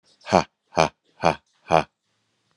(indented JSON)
{
  "exhalation_length": "2.6 s",
  "exhalation_amplitude": 30104,
  "exhalation_signal_mean_std_ratio": 0.26,
  "survey_phase": "alpha (2021-03-01 to 2021-08-12)",
  "age": "45-64",
  "gender": "Male",
  "wearing_mask": "No",
  "symptom_none": true,
  "smoker_status": "Never smoked",
  "respiratory_condition_asthma": false,
  "respiratory_condition_other": true,
  "recruitment_source": "REACT",
  "submission_delay": "1 day",
  "covid_test_result": "Negative",
  "covid_test_method": "RT-qPCR"
}